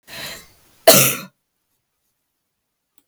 {"cough_length": "3.1 s", "cough_amplitude": 32768, "cough_signal_mean_std_ratio": 0.25, "survey_phase": "beta (2021-08-13 to 2022-03-07)", "age": "65+", "gender": "Female", "wearing_mask": "No", "symptom_none": true, "smoker_status": "Ex-smoker", "respiratory_condition_asthma": false, "respiratory_condition_other": false, "recruitment_source": "REACT", "submission_delay": "1 day", "covid_test_result": "Negative", "covid_test_method": "RT-qPCR"}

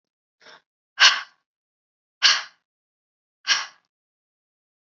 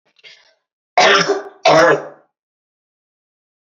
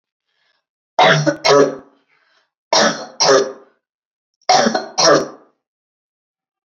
{"exhalation_length": "4.9 s", "exhalation_amplitude": 28760, "exhalation_signal_mean_std_ratio": 0.23, "cough_length": "3.8 s", "cough_amplitude": 29952, "cough_signal_mean_std_ratio": 0.38, "three_cough_length": "6.7 s", "three_cough_amplitude": 32767, "three_cough_signal_mean_std_ratio": 0.43, "survey_phase": "beta (2021-08-13 to 2022-03-07)", "age": "18-44", "gender": "Female", "wearing_mask": "No", "symptom_runny_or_blocked_nose": true, "symptom_abdominal_pain": true, "symptom_headache": true, "smoker_status": "Never smoked", "respiratory_condition_asthma": false, "respiratory_condition_other": false, "recruitment_source": "Test and Trace", "submission_delay": "1 day", "covid_test_result": "Positive", "covid_test_method": "ePCR"}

